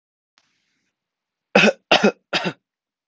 {"three_cough_length": "3.1 s", "three_cough_amplitude": 32767, "three_cough_signal_mean_std_ratio": 0.29, "survey_phase": "alpha (2021-03-01 to 2021-08-12)", "age": "18-44", "gender": "Male", "wearing_mask": "No", "symptom_cough_any": true, "symptom_diarrhoea": true, "symptom_fatigue": true, "symptom_fever_high_temperature": true, "symptom_headache": true, "symptom_change_to_sense_of_smell_or_taste": true, "symptom_loss_of_taste": true, "smoker_status": "Never smoked", "respiratory_condition_asthma": false, "respiratory_condition_other": false, "recruitment_source": "Test and Trace", "submission_delay": "2 days", "covid_test_result": "Positive", "covid_test_method": "RT-qPCR", "covid_ct_value": 26.0, "covid_ct_gene": "ORF1ab gene", "covid_ct_mean": 26.4, "covid_viral_load": "2100 copies/ml", "covid_viral_load_category": "Minimal viral load (< 10K copies/ml)"}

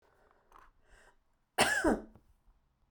{"cough_length": "2.9 s", "cough_amplitude": 7788, "cough_signal_mean_std_ratio": 0.31, "survey_phase": "beta (2021-08-13 to 2022-03-07)", "age": "45-64", "gender": "Female", "wearing_mask": "No", "symptom_sore_throat": true, "smoker_status": "Never smoked", "respiratory_condition_asthma": true, "respiratory_condition_other": false, "recruitment_source": "REACT", "submission_delay": "5 days", "covid_test_result": "Negative", "covid_test_method": "RT-qPCR"}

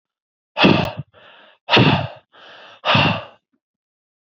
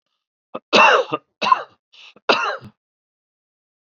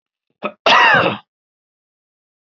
{"exhalation_length": "4.4 s", "exhalation_amplitude": 27826, "exhalation_signal_mean_std_ratio": 0.4, "three_cough_length": "3.8 s", "three_cough_amplitude": 28945, "three_cough_signal_mean_std_ratio": 0.34, "cough_length": "2.5 s", "cough_amplitude": 29235, "cough_signal_mean_std_ratio": 0.38, "survey_phase": "beta (2021-08-13 to 2022-03-07)", "age": "45-64", "gender": "Male", "wearing_mask": "No", "symptom_cough_any": true, "symptom_runny_or_blocked_nose": true, "symptom_sore_throat": true, "symptom_fatigue": true, "symptom_fever_high_temperature": true, "symptom_headache": true, "smoker_status": "Ex-smoker", "respiratory_condition_asthma": false, "respiratory_condition_other": false, "recruitment_source": "Test and Trace", "submission_delay": "2 days", "covid_test_result": "Positive", "covid_test_method": "ePCR"}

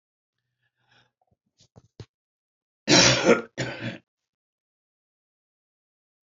{"cough_length": "6.2 s", "cough_amplitude": 22815, "cough_signal_mean_std_ratio": 0.25, "survey_phase": "alpha (2021-03-01 to 2021-08-12)", "age": "65+", "gender": "Male", "wearing_mask": "No", "symptom_none": true, "smoker_status": "Never smoked", "respiratory_condition_asthma": false, "respiratory_condition_other": false, "recruitment_source": "REACT", "submission_delay": "2 days", "covid_test_result": "Negative", "covid_test_method": "RT-qPCR"}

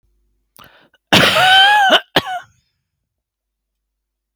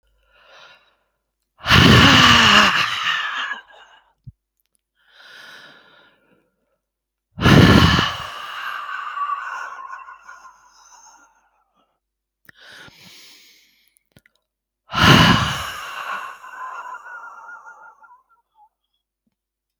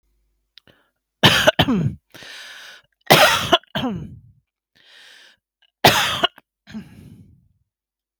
{"cough_length": "4.4 s", "cough_amplitude": 32768, "cough_signal_mean_std_ratio": 0.41, "exhalation_length": "19.8 s", "exhalation_amplitude": 32768, "exhalation_signal_mean_std_ratio": 0.36, "three_cough_length": "8.2 s", "three_cough_amplitude": 32768, "three_cough_signal_mean_std_ratio": 0.34, "survey_phase": "beta (2021-08-13 to 2022-03-07)", "age": "45-64", "gender": "Female", "wearing_mask": "No", "symptom_none": true, "smoker_status": "Ex-smoker", "respiratory_condition_asthma": false, "respiratory_condition_other": false, "recruitment_source": "REACT", "submission_delay": "7 days", "covid_test_result": "Negative", "covid_test_method": "RT-qPCR", "influenza_a_test_result": "Negative", "influenza_b_test_result": "Negative"}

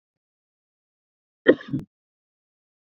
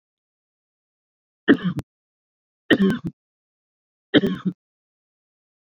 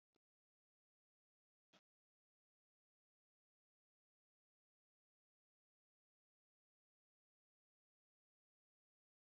{"cough_length": "3.0 s", "cough_amplitude": 27563, "cough_signal_mean_std_ratio": 0.15, "three_cough_length": "5.6 s", "three_cough_amplitude": 25033, "three_cough_signal_mean_std_ratio": 0.27, "exhalation_length": "9.4 s", "exhalation_amplitude": 39, "exhalation_signal_mean_std_ratio": 0.06, "survey_phase": "beta (2021-08-13 to 2022-03-07)", "age": "45-64", "gender": "Male", "wearing_mask": "No", "symptom_none": true, "smoker_status": "Never smoked", "respiratory_condition_asthma": false, "respiratory_condition_other": false, "recruitment_source": "REACT", "submission_delay": "1 day", "covid_test_result": "Negative", "covid_test_method": "RT-qPCR"}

